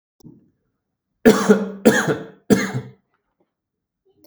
{
  "three_cough_length": "4.3 s",
  "three_cough_amplitude": 32768,
  "three_cough_signal_mean_std_ratio": 0.34,
  "survey_phase": "beta (2021-08-13 to 2022-03-07)",
  "age": "45-64",
  "gender": "Male",
  "wearing_mask": "No",
  "symptom_none": true,
  "smoker_status": "Never smoked",
  "respiratory_condition_asthma": false,
  "respiratory_condition_other": false,
  "recruitment_source": "REACT",
  "submission_delay": "4 days",
  "covid_test_result": "Negative",
  "covid_test_method": "RT-qPCR",
  "influenza_a_test_result": "Negative",
  "influenza_b_test_result": "Negative"
}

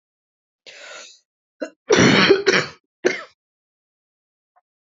{
  "cough_length": "4.9 s",
  "cough_amplitude": 28486,
  "cough_signal_mean_std_ratio": 0.34,
  "survey_phase": "beta (2021-08-13 to 2022-03-07)",
  "age": "18-44",
  "gender": "Female",
  "wearing_mask": "No",
  "symptom_cough_any": true,
  "symptom_new_continuous_cough": true,
  "symptom_runny_or_blocked_nose": true,
  "symptom_fatigue": true,
  "symptom_change_to_sense_of_smell_or_taste": true,
  "symptom_other": true,
  "symptom_onset": "8 days",
  "smoker_status": "Never smoked",
  "respiratory_condition_asthma": false,
  "respiratory_condition_other": false,
  "recruitment_source": "Test and Trace",
  "submission_delay": "4 days",
  "covid_test_result": "Negative",
  "covid_test_method": "RT-qPCR"
}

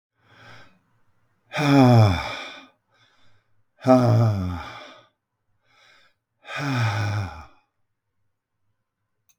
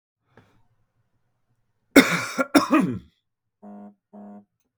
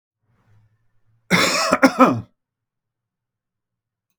{
  "exhalation_length": "9.4 s",
  "exhalation_amplitude": 25313,
  "exhalation_signal_mean_std_ratio": 0.4,
  "three_cough_length": "4.8 s",
  "three_cough_amplitude": 32768,
  "three_cough_signal_mean_std_ratio": 0.28,
  "cough_length": "4.2 s",
  "cough_amplitude": 32768,
  "cough_signal_mean_std_ratio": 0.32,
  "survey_phase": "beta (2021-08-13 to 2022-03-07)",
  "age": "65+",
  "gender": "Male",
  "wearing_mask": "No",
  "symptom_none": true,
  "smoker_status": "Current smoker (1 to 10 cigarettes per day)",
  "respiratory_condition_asthma": false,
  "respiratory_condition_other": false,
  "recruitment_source": "REACT",
  "submission_delay": "6 days",
  "covid_test_result": "Negative",
  "covid_test_method": "RT-qPCR"
}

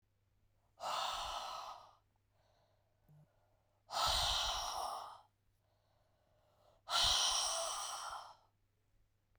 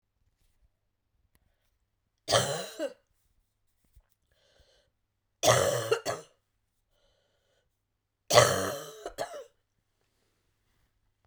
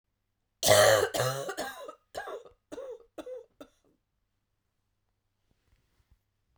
{
  "exhalation_length": "9.4 s",
  "exhalation_amplitude": 2671,
  "exhalation_signal_mean_std_ratio": 0.49,
  "three_cough_length": "11.3 s",
  "three_cough_amplitude": 19086,
  "three_cough_signal_mean_std_ratio": 0.27,
  "cough_length": "6.6 s",
  "cough_amplitude": 13505,
  "cough_signal_mean_std_ratio": 0.31,
  "survey_phase": "beta (2021-08-13 to 2022-03-07)",
  "age": "45-64",
  "gender": "Female",
  "wearing_mask": "No",
  "symptom_cough_any": true,
  "symptom_new_continuous_cough": true,
  "symptom_runny_or_blocked_nose": true,
  "symptom_sore_throat": true,
  "symptom_fatigue": true,
  "symptom_fever_high_temperature": true,
  "symptom_headache": true,
  "smoker_status": "Never smoked",
  "respiratory_condition_asthma": false,
  "respiratory_condition_other": false,
  "recruitment_source": "Test and Trace",
  "submission_delay": "2 days",
  "covid_test_result": "Positive",
  "covid_test_method": "RT-qPCR",
  "covid_ct_value": 27.4,
  "covid_ct_gene": "ORF1ab gene",
  "covid_ct_mean": 28.2,
  "covid_viral_load": "540 copies/ml",
  "covid_viral_load_category": "Minimal viral load (< 10K copies/ml)"
}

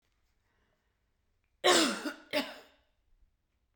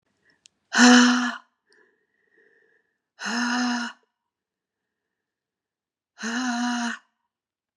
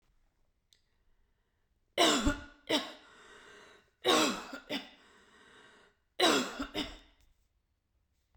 {
  "cough_length": "3.8 s",
  "cough_amplitude": 8159,
  "cough_signal_mean_std_ratio": 0.3,
  "exhalation_length": "7.8 s",
  "exhalation_amplitude": 26489,
  "exhalation_signal_mean_std_ratio": 0.35,
  "three_cough_length": "8.4 s",
  "three_cough_amplitude": 7824,
  "three_cough_signal_mean_std_ratio": 0.35,
  "survey_phase": "beta (2021-08-13 to 2022-03-07)",
  "age": "45-64",
  "gender": "Female",
  "wearing_mask": "No",
  "symptom_runny_or_blocked_nose": true,
  "symptom_fatigue": true,
  "symptom_onset": "6 days",
  "smoker_status": "Never smoked",
  "respiratory_condition_asthma": false,
  "respiratory_condition_other": false,
  "recruitment_source": "REACT",
  "submission_delay": "2 days",
  "covid_test_result": "Negative",
  "covid_test_method": "RT-qPCR",
  "covid_ct_value": 39.0,
  "covid_ct_gene": "N gene",
  "influenza_a_test_result": "Negative",
  "influenza_b_test_result": "Negative"
}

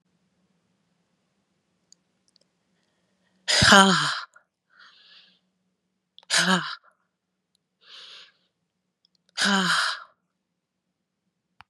{
  "exhalation_length": "11.7 s",
  "exhalation_amplitude": 31459,
  "exhalation_signal_mean_std_ratio": 0.27,
  "survey_phase": "beta (2021-08-13 to 2022-03-07)",
  "age": "45-64",
  "gender": "Female",
  "wearing_mask": "No",
  "symptom_cough_any": true,
  "symptom_runny_or_blocked_nose": true,
  "symptom_shortness_of_breath": true,
  "symptom_sore_throat": true,
  "symptom_fatigue": true,
  "symptom_fever_high_temperature": true,
  "symptom_headache": true,
  "symptom_onset": "7 days",
  "smoker_status": "Never smoked",
  "respiratory_condition_asthma": true,
  "respiratory_condition_other": false,
  "recruitment_source": "Test and Trace",
  "submission_delay": "1 day",
  "covid_test_result": "Positive",
  "covid_test_method": "ePCR"
}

